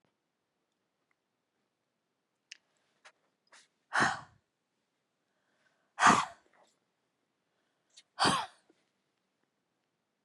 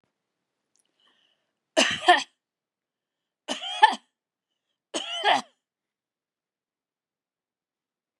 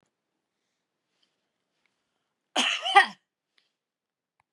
{
  "exhalation_length": "10.2 s",
  "exhalation_amplitude": 10911,
  "exhalation_signal_mean_std_ratio": 0.2,
  "three_cough_length": "8.2 s",
  "three_cough_amplitude": 28887,
  "three_cough_signal_mean_std_ratio": 0.23,
  "cough_length": "4.5 s",
  "cough_amplitude": 23243,
  "cough_signal_mean_std_ratio": 0.2,
  "survey_phase": "beta (2021-08-13 to 2022-03-07)",
  "age": "65+",
  "gender": "Female",
  "wearing_mask": "No",
  "symptom_none": true,
  "smoker_status": "Never smoked",
  "respiratory_condition_asthma": false,
  "respiratory_condition_other": false,
  "recruitment_source": "REACT",
  "submission_delay": "4 days",
  "covid_test_result": "Negative",
  "covid_test_method": "RT-qPCR",
  "influenza_a_test_result": "Negative",
  "influenza_b_test_result": "Negative"
}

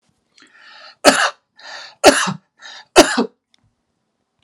{
  "three_cough_length": "4.4 s",
  "three_cough_amplitude": 32768,
  "three_cough_signal_mean_std_ratio": 0.31,
  "survey_phase": "alpha (2021-03-01 to 2021-08-12)",
  "age": "45-64",
  "gender": "Male",
  "wearing_mask": "No",
  "symptom_none": true,
  "smoker_status": "Never smoked",
  "respiratory_condition_asthma": false,
  "respiratory_condition_other": false,
  "recruitment_source": "REACT",
  "submission_delay": "2 days",
  "covid_test_result": "Negative",
  "covid_test_method": "RT-qPCR"
}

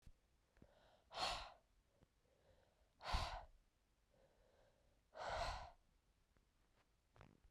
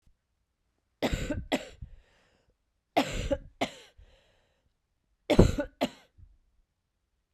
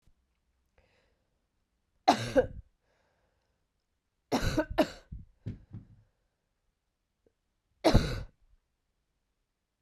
{
  "exhalation_length": "7.5 s",
  "exhalation_amplitude": 1083,
  "exhalation_signal_mean_std_ratio": 0.37,
  "cough_length": "7.3 s",
  "cough_amplitude": 22997,
  "cough_signal_mean_std_ratio": 0.28,
  "three_cough_length": "9.8 s",
  "three_cough_amplitude": 12336,
  "three_cough_signal_mean_std_ratio": 0.25,
  "survey_phase": "beta (2021-08-13 to 2022-03-07)",
  "age": "18-44",
  "gender": "Female",
  "wearing_mask": "No",
  "symptom_cough_any": true,
  "symptom_runny_or_blocked_nose": true,
  "symptom_loss_of_taste": true,
  "symptom_onset": "3 days",
  "smoker_status": "Never smoked",
  "respiratory_condition_asthma": false,
  "respiratory_condition_other": false,
  "recruitment_source": "Test and Trace",
  "submission_delay": "2 days",
  "covid_test_result": "Positive",
  "covid_test_method": "RT-qPCR"
}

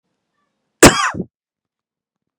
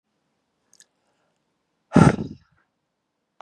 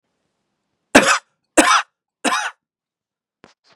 {
  "cough_length": "2.4 s",
  "cough_amplitude": 32768,
  "cough_signal_mean_std_ratio": 0.24,
  "exhalation_length": "3.4 s",
  "exhalation_amplitude": 31363,
  "exhalation_signal_mean_std_ratio": 0.19,
  "three_cough_length": "3.8 s",
  "three_cough_amplitude": 32768,
  "three_cough_signal_mean_std_ratio": 0.32,
  "survey_phase": "beta (2021-08-13 to 2022-03-07)",
  "age": "45-64",
  "gender": "Male",
  "wearing_mask": "No",
  "symptom_cough_any": true,
  "symptom_sore_throat": true,
  "symptom_fatigue": true,
  "symptom_headache": true,
  "symptom_other": true,
  "smoker_status": "Never smoked",
  "respiratory_condition_asthma": false,
  "respiratory_condition_other": false,
  "recruitment_source": "Test and Trace",
  "submission_delay": "2 days",
  "covid_test_result": "Positive",
  "covid_test_method": "RT-qPCR",
  "covid_ct_value": 25.0,
  "covid_ct_gene": "ORF1ab gene"
}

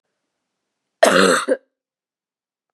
{
  "cough_length": "2.7 s",
  "cough_amplitude": 32768,
  "cough_signal_mean_std_ratio": 0.32,
  "survey_phase": "beta (2021-08-13 to 2022-03-07)",
  "age": "18-44",
  "gender": "Female",
  "wearing_mask": "No",
  "symptom_cough_any": true,
  "symptom_runny_or_blocked_nose": true,
  "symptom_shortness_of_breath": true,
  "symptom_sore_throat": true,
  "symptom_fatigue": true,
  "symptom_headache": true,
  "symptom_change_to_sense_of_smell_or_taste": true,
  "symptom_loss_of_taste": true,
  "smoker_status": "Never smoked",
  "respiratory_condition_asthma": true,
  "respiratory_condition_other": false,
  "recruitment_source": "Test and Trace",
  "submission_delay": "2 days",
  "covid_test_result": "Positive",
  "covid_test_method": "RT-qPCR",
  "covid_ct_value": 15.2,
  "covid_ct_gene": "ORF1ab gene",
  "covid_ct_mean": 15.5,
  "covid_viral_load": "8200000 copies/ml",
  "covid_viral_load_category": "High viral load (>1M copies/ml)"
}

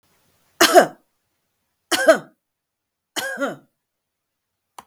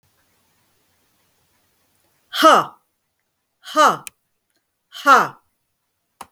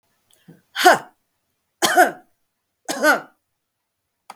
{
  "cough_length": "4.9 s",
  "cough_amplitude": 32768,
  "cough_signal_mean_std_ratio": 0.27,
  "exhalation_length": "6.3 s",
  "exhalation_amplitude": 32768,
  "exhalation_signal_mean_std_ratio": 0.27,
  "three_cough_length": "4.4 s",
  "three_cough_amplitude": 32768,
  "three_cough_signal_mean_std_ratio": 0.31,
  "survey_phase": "beta (2021-08-13 to 2022-03-07)",
  "age": "45-64",
  "gender": "Female",
  "wearing_mask": "No",
  "symptom_cough_any": true,
  "smoker_status": "Ex-smoker",
  "respiratory_condition_asthma": true,
  "respiratory_condition_other": false,
  "recruitment_source": "REACT",
  "submission_delay": "2 days",
  "covid_test_result": "Negative",
  "covid_test_method": "RT-qPCR",
  "influenza_a_test_result": "Negative",
  "influenza_b_test_result": "Negative"
}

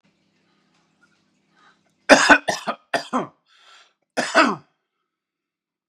{
  "cough_length": "5.9 s",
  "cough_amplitude": 32768,
  "cough_signal_mean_std_ratio": 0.27,
  "survey_phase": "beta (2021-08-13 to 2022-03-07)",
  "age": "45-64",
  "gender": "Male",
  "wearing_mask": "No",
  "symptom_sore_throat": true,
  "smoker_status": "Ex-smoker",
  "respiratory_condition_asthma": true,
  "respiratory_condition_other": false,
  "recruitment_source": "REACT",
  "submission_delay": "3 days",
  "covid_test_result": "Negative",
  "covid_test_method": "RT-qPCR",
  "influenza_a_test_result": "Negative",
  "influenza_b_test_result": "Negative"
}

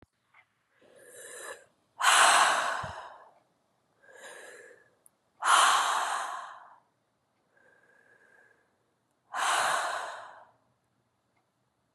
{
  "exhalation_length": "11.9 s",
  "exhalation_amplitude": 13918,
  "exhalation_signal_mean_std_ratio": 0.38,
  "survey_phase": "beta (2021-08-13 to 2022-03-07)",
  "age": "45-64",
  "gender": "Female",
  "wearing_mask": "No",
  "symptom_cough_any": true,
  "symptom_new_continuous_cough": true,
  "symptom_runny_or_blocked_nose": true,
  "symptom_sore_throat": true,
  "symptom_abdominal_pain": true,
  "symptom_fatigue": true,
  "symptom_fever_high_temperature": true,
  "symptom_headache": true,
  "smoker_status": "Never smoked",
  "respiratory_condition_asthma": false,
  "respiratory_condition_other": false,
  "recruitment_source": "Test and Trace",
  "submission_delay": "2 days",
  "covid_test_result": "Positive",
  "covid_test_method": "LFT"
}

